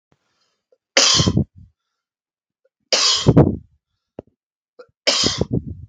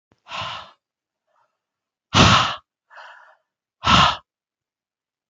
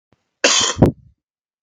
{
  "three_cough_length": "5.9 s",
  "three_cough_amplitude": 32768,
  "three_cough_signal_mean_std_ratio": 0.39,
  "exhalation_length": "5.3 s",
  "exhalation_amplitude": 29872,
  "exhalation_signal_mean_std_ratio": 0.31,
  "cough_length": "1.6 s",
  "cough_amplitude": 32768,
  "cough_signal_mean_std_ratio": 0.39,
  "survey_phase": "beta (2021-08-13 to 2022-03-07)",
  "age": "18-44",
  "gender": "Male",
  "wearing_mask": "No",
  "symptom_cough_any": true,
  "symptom_runny_or_blocked_nose": true,
  "symptom_sore_throat": true,
  "symptom_onset": "12 days",
  "smoker_status": "Never smoked",
  "respiratory_condition_asthma": false,
  "respiratory_condition_other": false,
  "recruitment_source": "REACT",
  "submission_delay": "3 days",
  "covid_test_result": "Negative",
  "covid_test_method": "RT-qPCR",
  "influenza_a_test_result": "Negative",
  "influenza_b_test_result": "Negative"
}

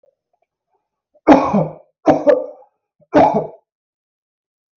{
  "three_cough_length": "4.8 s",
  "three_cough_amplitude": 32768,
  "three_cough_signal_mean_std_ratio": 0.36,
  "survey_phase": "beta (2021-08-13 to 2022-03-07)",
  "age": "18-44",
  "gender": "Male",
  "wearing_mask": "No",
  "symptom_none": true,
  "smoker_status": "Never smoked",
  "respiratory_condition_asthma": false,
  "respiratory_condition_other": false,
  "recruitment_source": "REACT",
  "submission_delay": "1 day",
  "covid_test_result": "Negative",
  "covid_test_method": "RT-qPCR"
}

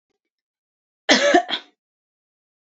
{
  "cough_length": "2.7 s",
  "cough_amplitude": 32767,
  "cough_signal_mean_std_ratio": 0.3,
  "survey_phase": "beta (2021-08-13 to 2022-03-07)",
  "age": "18-44",
  "gender": "Female",
  "wearing_mask": "No",
  "symptom_cough_any": true,
  "symptom_runny_or_blocked_nose": true,
  "symptom_fatigue": true,
  "symptom_fever_high_temperature": true,
  "symptom_other": true,
  "smoker_status": "Never smoked",
  "respiratory_condition_asthma": false,
  "respiratory_condition_other": false,
  "recruitment_source": "Test and Trace",
  "submission_delay": "2 days",
  "covid_test_result": "Positive",
  "covid_test_method": "RT-qPCR"
}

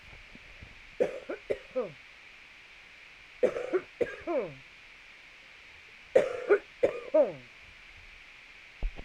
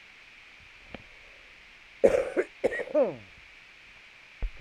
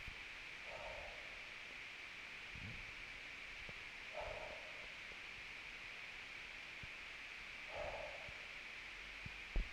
{
  "three_cough_length": "9.0 s",
  "three_cough_amplitude": 12149,
  "three_cough_signal_mean_std_ratio": 0.4,
  "cough_length": "4.6 s",
  "cough_amplitude": 17592,
  "cough_signal_mean_std_ratio": 0.37,
  "exhalation_length": "9.7 s",
  "exhalation_amplitude": 1305,
  "exhalation_signal_mean_std_ratio": 1.06,
  "survey_phase": "beta (2021-08-13 to 2022-03-07)",
  "age": "45-64",
  "gender": "Female",
  "wearing_mask": "No",
  "symptom_none": true,
  "smoker_status": "Current smoker (11 or more cigarettes per day)",
  "respiratory_condition_asthma": false,
  "respiratory_condition_other": false,
  "recruitment_source": "REACT",
  "submission_delay": "2 days",
  "covid_test_result": "Negative",
  "covid_test_method": "RT-qPCR",
  "influenza_a_test_result": "Unknown/Void",
  "influenza_b_test_result": "Unknown/Void"
}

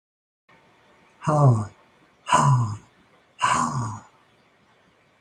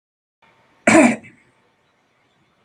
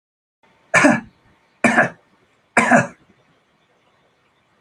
{
  "exhalation_length": "5.2 s",
  "exhalation_amplitude": 18570,
  "exhalation_signal_mean_std_ratio": 0.43,
  "cough_length": "2.6 s",
  "cough_amplitude": 29535,
  "cough_signal_mean_std_ratio": 0.27,
  "three_cough_length": "4.6 s",
  "three_cough_amplitude": 30956,
  "three_cough_signal_mean_std_ratio": 0.33,
  "survey_phase": "beta (2021-08-13 to 2022-03-07)",
  "age": "65+",
  "gender": "Male",
  "wearing_mask": "No",
  "symptom_none": true,
  "smoker_status": "Never smoked",
  "respiratory_condition_asthma": false,
  "respiratory_condition_other": false,
  "recruitment_source": "REACT",
  "submission_delay": "1 day",
  "covid_test_result": "Negative",
  "covid_test_method": "RT-qPCR"
}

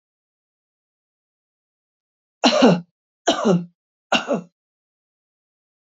{
  "three_cough_length": "5.8 s",
  "three_cough_amplitude": 26783,
  "three_cough_signal_mean_std_ratio": 0.3,
  "survey_phase": "beta (2021-08-13 to 2022-03-07)",
  "age": "65+",
  "gender": "Female",
  "wearing_mask": "No",
  "symptom_none": true,
  "smoker_status": "Ex-smoker",
  "respiratory_condition_asthma": false,
  "respiratory_condition_other": false,
  "recruitment_source": "REACT",
  "submission_delay": "2 days",
  "covid_test_result": "Negative",
  "covid_test_method": "RT-qPCR",
  "influenza_a_test_result": "Negative",
  "influenza_b_test_result": "Negative"
}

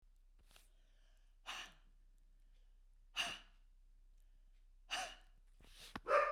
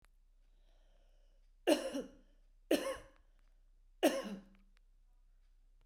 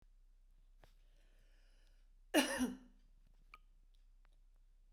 {
  "exhalation_length": "6.3 s",
  "exhalation_amplitude": 3161,
  "exhalation_signal_mean_std_ratio": 0.34,
  "three_cough_length": "5.9 s",
  "three_cough_amplitude": 6748,
  "three_cough_signal_mean_std_ratio": 0.31,
  "cough_length": "4.9 s",
  "cough_amplitude": 3635,
  "cough_signal_mean_std_ratio": 0.29,
  "survey_phase": "beta (2021-08-13 to 2022-03-07)",
  "age": "45-64",
  "gender": "Female",
  "wearing_mask": "No",
  "symptom_none": true,
  "smoker_status": "Ex-smoker",
  "respiratory_condition_asthma": false,
  "respiratory_condition_other": false,
  "recruitment_source": "REACT",
  "submission_delay": "2 days",
  "covid_test_result": "Negative",
  "covid_test_method": "RT-qPCR"
}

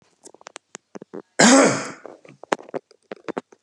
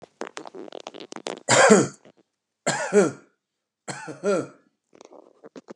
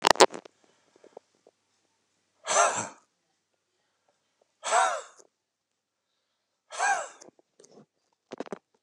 {
  "cough_length": "3.6 s",
  "cough_amplitude": 31835,
  "cough_signal_mean_std_ratio": 0.31,
  "three_cough_length": "5.8 s",
  "three_cough_amplitude": 32677,
  "three_cough_signal_mean_std_ratio": 0.34,
  "exhalation_length": "8.8 s",
  "exhalation_amplitude": 32767,
  "exhalation_signal_mean_std_ratio": 0.24,
  "survey_phase": "beta (2021-08-13 to 2022-03-07)",
  "age": "65+",
  "gender": "Male",
  "wearing_mask": "No",
  "symptom_cough_any": true,
  "symptom_onset": "13 days",
  "smoker_status": "Ex-smoker",
  "respiratory_condition_asthma": false,
  "respiratory_condition_other": false,
  "recruitment_source": "REACT",
  "submission_delay": "1 day",
  "covid_test_result": "Positive",
  "covid_test_method": "RT-qPCR",
  "covid_ct_value": 35.0,
  "covid_ct_gene": "E gene",
  "influenza_a_test_result": "Negative",
  "influenza_b_test_result": "Negative"
}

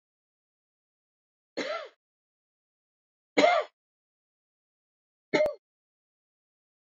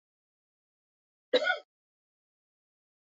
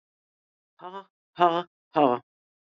{
  "three_cough_length": "6.8 s",
  "three_cough_amplitude": 12650,
  "three_cough_signal_mean_std_ratio": 0.23,
  "cough_length": "3.1 s",
  "cough_amplitude": 6785,
  "cough_signal_mean_std_ratio": 0.2,
  "exhalation_length": "2.7 s",
  "exhalation_amplitude": 16318,
  "exhalation_signal_mean_std_ratio": 0.28,
  "survey_phase": "beta (2021-08-13 to 2022-03-07)",
  "age": "45-64",
  "gender": "Male",
  "wearing_mask": "Yes",
  "symptom_cough_any": true,
  "symptom_runny_or_blocked_nose": true,
  "smoker_status": "Never smoked",
  "respiratory_condition_asthma": false,
  "respiratory_condition_other": false,
  "recruitment_source": "Test and Trace",
  "submission_delay": "1 day",
  "covid_test_result": "Negative",
  "covid_test_method": "ePCR"
}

